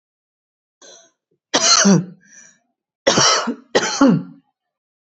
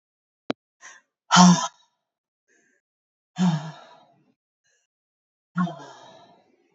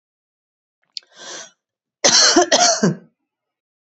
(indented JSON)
{
  "three_cough_length": "5.0 s",
  "three_cough_amplitude": 31606,
  "three_cough_signal_mean_std_ratio": 0.43,
  "exhalation_length": "6.7 s",
  "exhalation_amplitude": 28466,
  "exhalation_signal_mean_std_ratio": 0.26,
  "cough_length": "3.9 s",
  "cough_amplitude": 32425,
  "cough_signal_mean_std_ratio": 0.38,
  "survey_phase": "beta (2021-08-13 to 2022-03-07)",
  "age": "45-64",
  "gender": "Female",
  "wearing_mask": "No",
  "symptom_none": true,
  "smoker_status": "Ex-smoker",
  "respiratory_condition_asthma": false,
  "respiratory_condition_other": false,
  "recruitment_source": "REACT",
  "submission_delay": "2 days",
  "covid_test_result": "Negative",
  "covid_test_method": "RT-qPCR"
}